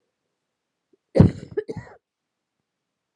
{"cough_length": "3.2 s", "cough_amplitude": 31719, "cough_signal_mean_std_ratio": 0.2, "survey_phase": "beta (2021-08-13 to 2022-03-07)", "age": "18-44", "gender": "Female", "wearing_mask": "No", "symptom_cough_any": true, "symptom_runny_or_blocked_nose": true, "symptom_shortness_of_breath": true, "symptom_sore_throat": true, "symptom_diarrhoea": true, "symptom_fatigue": true, "symptom_fever_high_temperature": true, "symptom_headache": true, "symptom_other": true, "symptom_onset": "6 days", "smoker_status": "Ex-smoker", "respiratory_condition_asthma": true, "respiratory_condition_other": false, "recruitment_source": "Test and Trace", "submission_delay": "2 days", "covid_test_result": "Positive", "covid_test_method": "RT-qPCR", "covid_ct_value": 17.9, "covid_ct_gene": "ORF1ab gene", "covid_ct_mean": 18.3, "covid_viral_load": "970000 copies/ml", "covid_viral_load_category": "Low viral load (10K-1M copies/ml)"}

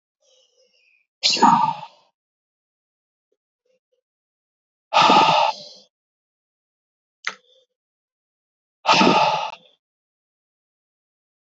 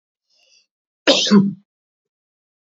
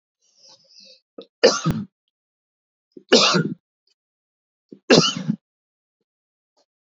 {"exhalation_length": "11.5 s", "exhalation_amplitude": 26203, "exhalation_signal_mean_std_ratio": 0.31, "cough_length": "2.6 s", "cough_amplitude": 30120, "cough_signal_mean_std_ratio": 0.31, "three_cough_length": "6.9 s", "three_cough_amplitude": 31816, "three_cough_signal_mean_std_ratio": 0.29, "survey_phase": "beta (2021-08-13 to 2022-03-07)", "age": "45-64", "gender": "Male", "wearing_mask": "No", "symptom_abdominal_pain": true, "symptom_fatigue": true, "symptom_headache": true, "symptom_change_to_sense_of_smell_or_taste": true, "symptom_loss_of_taste": true, "symptom_onset": "6 days", "smoker_status": "Never smoked", "respiratory_condition_asthma": false, "respiratory_condition_other": false, "recruitment_source": "Test and Trace", "submission_delay": "2 days", "covid_test_result": "Positive", "covid_test_method": "RT-qPCR", "covid_ct_value": 19.8, "covid_ct_gene": "ORF1ab gene"}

